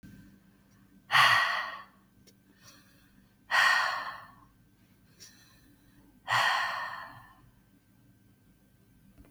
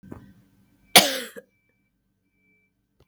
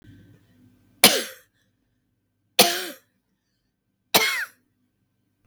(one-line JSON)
{"exhalation_length": "9.3 s", "exhalation_amplitude": 10420, "exhalation_signal_mean_std_ratio": 0.37, "cough_length": "3.1 s", "cough_amplitude": 32768, "cough_signal_mean_std_ratio": 0.18, "three_cough_length": "5.5 s", "three_cough_amplitude": 32768, "three_cough_signal_mean_std_ratio": 0.25, "survey_phase": "beta (2021-08-13 to 2022-03-07)", "age": "45-64", "gender": "Female", "wearing_mask": "No", "symptom_cough_any": true, "symptom_runny_or_blocked_nose": true, "symptom_sore_throat": true, "symptom_onset": "3 days", "smoker_status": "Never smoked", "respiratory_condition_asthma": true, "respiratory_condition_other": false, "recruitment_source": "Test and Trace", "submission_delay": "1 day", "covid_test_result": "Positive", "covid_test_method": "RT-qPCR", "covid_ct_value": 23.9, "covid_ct_gene": "ORF1ab gene", "covid_ct_mean": 24.0, "covid_viral_load": "13000 copies/ml", "covid_viral_load_category": "Low viral load (10K-1M copies/ml)"}